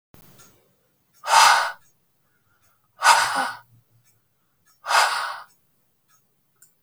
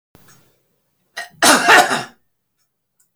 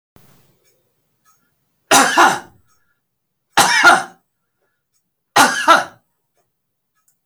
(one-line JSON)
{"exhalation_length": "6.8 s", "exhalation_amplitude": 29025, "exhalation_signal_mean_std_ratio": 0.34, "cough_length": "3.2 s", "cough_amplitude": 31144, "cough_signal_mean_std_ratio": 0.34, "three_cough_length": "7.3 s", "three_cough_amplitude": 32552, "three_cough_signal_mean_std_ratio": 0.34, "survey_phase": "beta (2021-08-13 to 2022-03-07)", "age": "65+", "gender": "Male", "wearing_mask": "No", "symptom_none": true, "smoker_status": "Ex-smoker", "respiratory_condition_asthma": false, "respiratory_condition_other": false, "recruitment_source": "REACT", "submission_delay": "2 days", "covid_test_result": "Negative", "covid_test_method": "RT-qPCR"}